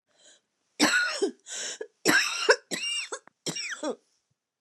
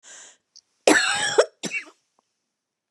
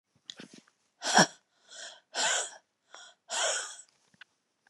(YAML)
three_cough_length: 4.6 s
three_cough_amplitude: 16885
three_cough_signal_mean_std_ratio: 0.49
cough_length: 2.9 s
cough_amplitude: 28113
cough_signal_mean_std_ratio: 0.35
exhalation_length: 4.7 s
exhalation_amplitude: 14235
exhalation_signal_mean_std_ratio: 0.34
survey_phase: beta (2021-08-13 to 2022-03-07)
age: 45-64
gender: Female
wearing_mask: 'No'
symptom_cough_any: true
symptom_runny_or_blocked_nose: true
symptom_sore_throat: true
symptom_fatigue: true
symptom_onset: 3 days
smoker_status: Never smoked
respiratory_condition_asthma: false
respiratory_condition_other: false
recruitment_source: Test and Trace
submission_delay: 1 day
covid_test_result: Negative
covid_test_method: RT-qPCR